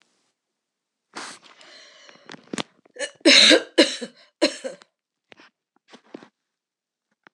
{"three_cough_length": "7.3 s", "three_cough_amplitude": 25823, "three_cough_signal_mean_std_ratio": 0.25, "survey_phase": "alpha (2021-03-01 to 2021-08-12)", "age": "65+", "gender": "Female", "wearing_mask": "No", "symptom_none": true, "smoker_status": "Never smoked", "respiratory_condition_asthma": false, "respiratory_condition_other": false, "recruitment_source": "REACT", "submission_delay": "1 day", "covid_test_result": "Negative", "covid_test_method": "RT-qPCR"}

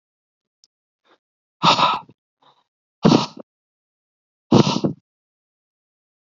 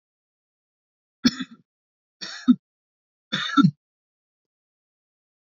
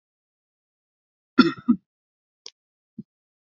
{"exhalation_length": "6.4 s", "exhalation_amplitude": 29480, "exhalation_signal_mean_std_ratio": 0.28, "three_cough_length": "5.5 s", "three_cough_amplitude": 19948, "three_cough_signal_mean_std_ratio": 0.22, "cough_length": "3.6 s", "cough_amplitude": 28648, "cough_signal_mean_std_ratio": 0.17, "survey_phase": "beta (2021-08-13 to 2022-03-07)", "age": "18-44", "gender": "Male", "wearing_mask": "No", "symptom_none": true, "smoker_status": "Current smoker (e-cigarettes or vapes only)", "respiratory_condition_asthma": true, "respiratory_condition_other": false, "recruitment_source": "REACT", "submission_delay": "2 days", "covid_test_result": "Negative", "covid_test_method": "RT-qPCR", "influenza_a_test_result": "Negative", "influenza_b_test_result": "Negative"}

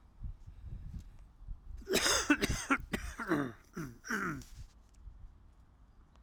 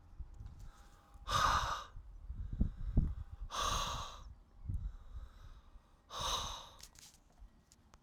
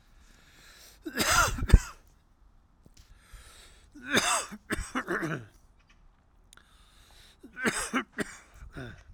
{"cough_length": "6.2 s", "cough_amplitude": 6426, "cough_signal_mean_std_ratio": 0.52, "exhalation_length": "8.0 s", "exhalation_amplitude": 4077, "exhalation_signal_mean_std_ratio": 0.56, "three_cough_length": "9.1 s", "three_cough_amplitude": 23571, "three_cough_signal_mean_std_ratio": 0.35, "survey_phase": "alpha (2021-03-01 to 2021-08-12)", "age": "45-64", "gender": "Male", "wearing_mask": "No", "symptom_cough_any": true, "symptom_fatigue": true, "symptom_change_to_sense_of_smell_or_taste": true, "smoker_status": "Never smoked", "respiratory_condition_asthma": false, "respiratory_condition_other": false, "recruitment_source": "Test and Trace", "submission_delay": "1 day", "covid_test_result": "Positive", "covid_test_method": "RT-qPCR", "covid_ct_value": 17.9, "covid_ct_gene": "ORF1ab gene", "covid_ct_mean": 18.6, "covid_viral_load": "820000 copies/ml", "covid_viral_load_category": "Low viral load (10K-1M copies/ml)"}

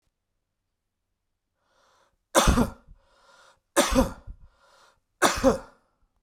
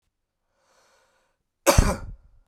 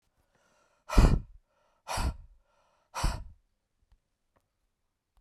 {"three_cough_length": "6.2 s", "three_cough_amplitude": 23446, "three_cough_signal_mean_std_ratio": 0.31, "cough_length": "2.5 s", "cough_amplitude": 26758, "cough_signal_mean_std_ratio": 0.26, "exhalation_length": "5.2 s", "exhalation_amplitude": 15273, "exhalation_signal_mean_std_ratio": 0.26, "survey_phase": "beta (2021-08-13 to 2022-03-07)", "age": "45-64", "gender": "Male", "wearing_mask": "No", "symptom_cough_any": true, "symptom_runny_or_blocked_nose": true, "symptom_diarrhoea": true, "symptom_fatigue": true, "symptom_onset": "4 days", "smoker_status": "Never smoked", "respiratory_condition_asthma": false, "respiratory_condition_other": false, "recruitment_source": "Test and Trace", "submission_delay": "2 days", "covid_test_result": "Positive", "covid_test_method": "RT-qPCR", "covid_ct_value": 32.2, "covid_ct_gene": "ORF1ab gene"}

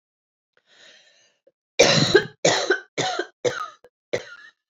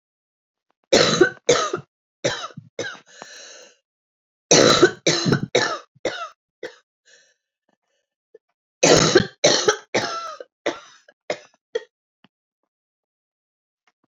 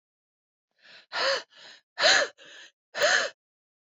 {"cough_length": "4.7 s", "cough_amplitude": 27776, "cough_signal_mean_std_ratio": 0.39, "three_cough_length": "14.1 s", "three_cough_amplitude": 29003, "three_cough_signal_mean_std_ratio": 0.35, "exhalation_length": "3.9 s", "exhalation_amplitude": 15298, "exhalation_signal_mean_std_ratio": 0.38, "survey_phase": "beta (2021-08-13 to 2022-03-07)", "age": "45-64", "gender": "Female", "wearing_mask": "No", "symptom_cough_any": true, "symptom_runny_or_blocked_nose": true, "symptom_shortness_of_breath": true, "symptom_sore_throat": true, "symptom_fatigue": true, "symptom_headache": true, "symptom_change_to_sense_of_smell_or_taste": true, "symptom_loss_of_taste": true, "symptom_other": true, "symptom_onset": "4 days", "smoker_status": "Never smoked", "respiratory_condition_asthma": false, "respiratory_condition_other": false, "recruitment_source": "Test and Trace", "submission_delay": "2 days", "covid_test_result": "Positive", "covid_test_method": "RT-qPCR"}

